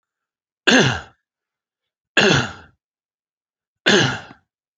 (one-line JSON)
{"three_cough_length": "4.8 s", "three_cough_amplitude": 32768, "three_cough_signal_mean_std_ratio": 0.35, "survey_phase": "beta (2021-08-13 to 2022-03-07)", "age": "45-64", "gender": "Male", "wearing_mask": "No", "symptom_sore_throat": true, "symptom_fatigue": true, "symptom_onset": "4 days", "smoker_status": "Never smoked", "respiratory_condition_asthma": false, "respiratory_condition_other": false, "recruitment_source": "REACT", "submission_delay": "2 days", "covid_test_result": "Negative", "covid_test_method": "RT-qPCR"}